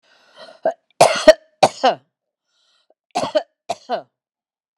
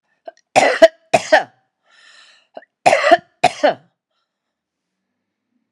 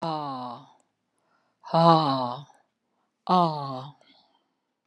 cough_length: 4.8 s
cough_amplitude: 32768
cough_signal_mean_std_ratio: 0.28
three_cough_length: 5.7 s
three_cough_amplitude: 32768
three_cough_signal_mean_std_ratio: 0.3
exhalation_length: 4.9 s
exhalation_amplitude: 20113
exhalation_signal_mean_std_ratio: 0.39
survey_phase: alpha (2021-03-01 to 2021-08-12)
age: 65+
gender: Female
wearing_mask: 'No'
symptom_none: true
smoker_status: Never smoked
respiratory_condition_asthma: false
respiratory_condition_other: false
recruitment_source: REACT
submission_delay: 1 day
covid_test_result: Negative
covid_test_method: RT-qPCR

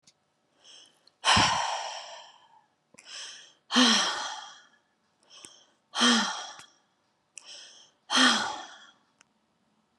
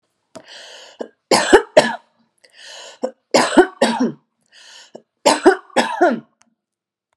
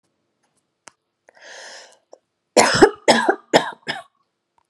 exhalation_length: 10.0 s
exhalation_amplitude: 12600
exhalation_signal_mean_std_ratio: 0.39
three_cough_length: 7.2 s
three_cough_amplitude: 32768
three_cough_signal_mean_std_ratio: 0.37
cough_length: 4.7 s
cough_amplitude: 32768
cough_signal_mean_std_ratio: 0.3
survey_phase: beta (2021-08-13 to 2022-03-07)
age: 45-64
gender: Female
wearing_mask: 'No'
symptom_none: true
smoker_status: Current smoker (11 or more cigarettes per day)
respiratory_condition_asthma: false
respiratory_condition_other: false
recruitment_source: REACT
submission_delay: 2 days
covid_test_result: Negative
covid_test_method: RT-qPCR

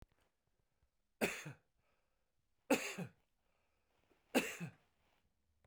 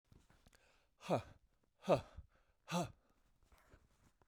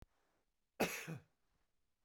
three_cough_length: 5.7 s
three_cough_amplitude: 3464
three_cough_signal_mean_std_ratio: 0.27
exhalation_length: 4.3 s
exhalation_amplitude: 2983
exhalation_signal_mean_std_ratio: 0.27
cough_length: 2.0 s
cough_amplitude: 2361
cough_signal_mean_std_ratio: 0.3
survey_phase: beta (2021-08-13 to 2022-03-07)
age: 45-64
gender: Male
wearing_mask: 'No'
symptom_none: true
smoker_status: Ex-smoker
respiratory_condition_asthma: false
respiratory_condition_other: false
recruitment_source: REACT
submission_delay: 5 days
covid_test_result: Negative
covid_test_method: RT-qPCR
influenza_a_test_result: Negative
influenza_b_test_result: Negative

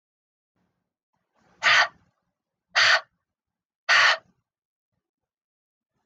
exhalation_length: 6.1 s
exhalation_amplitude: 18258
exhalation_signal_mean_std_ratio: 0.29
survey_phase: beta (2021-08-13 to 2022-03-07)
age: 45-64
gender: Female
wearing_mask: 'No'
symptom_sore_throat: true
smoker_status: Never smoked
respiratory_condition_asthma: false
respiratory_condition_other: false
recruitment_source: REACT
submission_delay: 3 days
covid_test_result: Negative
covid_test_method: RT-qPCR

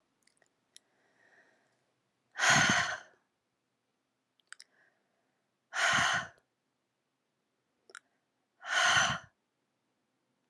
exhalation_length: 10.5 s
exhalation_amplitude: 7991
exhalation_signal_mean_std_ratio: 0.31
survey_phase: alpha (2021-03-01 to 2021-08-12)
age: 18-44
gender: Female
wearing_mask: 'No'
symptom_cough_any: true
symptom_fatigue: true
symptom_headache: true
symptom_onset: 2 days
smoker_status: Never smoked
respiratory_condition_asthma: false
respiratory_condition_other: false
recruitment_source: Test and Trace
submission_delay: 2 days
covid_test_result: Positive
covid_test_method: RT-qPCR
covid_ct_value: 26.8
covid_ct_gene: N gene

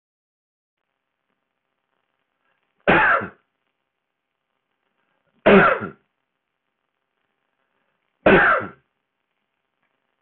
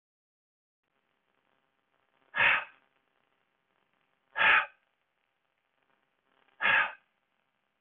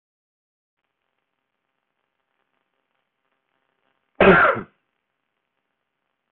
three_cough_length: 10.2 s
three_cough_amplitude: 24180
three_cough_signal_mean_std_ratio: 0.26
exhalation_length: 7.8 s
exhalation_amplitude: 8521
exhalation_signal_mean_std_ratio: 0.26
cough_length: 6.3 s
cough_amplitude: 24424
cough_signal_mean_std_ratio: 0.19
survey_phase: beta (2021-08-13 to 2022-03-07)
age: 45-64
gender: Male
wearing_mask: 'No'
symptom_none: true
smoker_status: Prefer not to say
respiratory_condition_asthma: false
respiratory_condition_other: false
recruitment_source: REACT
submission_delay: 2 days
covid_test_result: Negative
covid_test_method: RT-qPCR
influenza_a_test_result: Negative
influenza_b_test_result: Negative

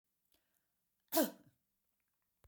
cough_length: 2.5 s
cough_amplitude: 4008
cough_signal_mean_std_ratio: 0.2
survey_phase: beta (2021-08-13 to 2022-03-07)
age: 65+
gender: Female
wearing_mask: 'No'
symptom_none: true
smoker_status: Never smoked
respiratory_condition_asthma: false
respiratory_condition_other: false
recruitment_source: REACT
submission_delay: 1 day
covid_test_result: Negative
covid_test_method: RT-qPCR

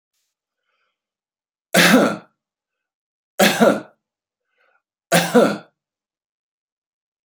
three_cough_length: 7.2 s
three_cough_amplitude: 32767
three_cough_signal_mean_std_ratio: 0.31
survey_phase: beta (2021-08-13 to 2022-03-07)
age: 65+
gender: Male
wearing_mask: 'No'
symptom_none: true
smoker_status: Ex-smoker
respiratory_condition_asthma: false
respiratory_condition_other: false
recruitment_source: REACT
submission_delay: 1 day
covid_test_result: Negative
covid_test_method: RT-qPCR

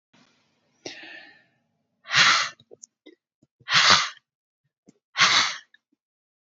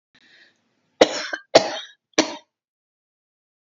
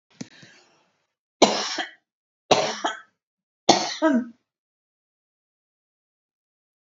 exhalation_length: 6.5 s
exhalation_amplitude: 25280
exhalation_signal_mean_std_ratio: 0.33
cough_length: 3.8 s
cough_amplitude: 32768
cough_signal_mean_std_ratio: 0.23
three_cough_length: 6.9 s
three_cough_amplitude: 28619
three_cough_signal_mean_std_ratio: 0.29
survey_phase: beta (2021-08-13 to 2022-03-07)
age: 65+
gender: Female
wearing_mask: 'No'
symptom_none: true
smoker_status: Never smoked
respiratory_condition_asthma: true
respiratory_condition_other: false
recruitment_source: REACT
submission_delay: 1 day
covid_test_result: Negative
covid_test_method: RT-qPCR
influenza_a_test_result: Negative
influenza_b_test_result: Negative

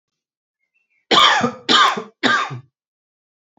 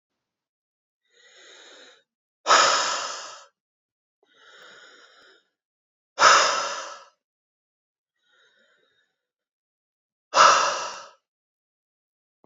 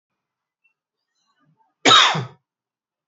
three_cough_length: 3.6 s
three_cough_amplitude: 31656
three_cough_signal_mean_std_ratio: 0.43
exhalation_length: 12.5 s
exhalation_amplitude: 26203
exhalation_signal_mean_std_ratio: 0.28
cough_length: 3.1 s
cough_amplitude: 31127
cough_signal_mean_std_ratio: 0.26
survey_phase: alpha (2021-03-01 to 2021-08-12)
age: 18-44
gender: Male
wearing_mask: 'No'
symptom_diarrhoea: true
smoker_status: Ex-smoker
respiratory_condition_asthma: true
respiratory_condition_other: false
recruitment_source: REACT
submission_delay: 1 day
covid_test_result: Negative
covid_test_method: RT-qPCR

